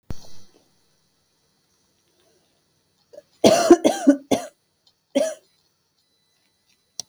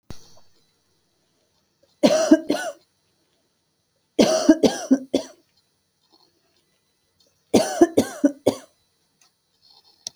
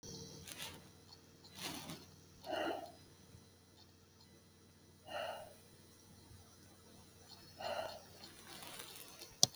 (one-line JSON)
{"cough_length": "7.1 s", "cough_amplitude": 31801, "cough_signal_mean_std_ratio": 0.27, "three_cough_length": "10.2 s", "three_cough_amplitude": 29931, "three_cough_signal_mean_std_ratio": 0.3, "exhalation_length": "9.6 s", "exhalation_amplitude": 16515, "exhalation_signal_mean_std_ratio": 0.43, "survey_phase": "beta (2021-08-13 to 2022-03-07)", "age": "18-44", "gender": "Female", "wearing_mask": "No", "symptom_none": true, "smoker_status": "Current smoker (e-cigarettes or vapes only)", "respiratory_condition_asthma": false, "respiratory_condition_other": false, "recruitment_source": "REACT", "submission_delay": "1 day", "covid_test_result": "Negative", "covid_test_method": "RT-qPCR"}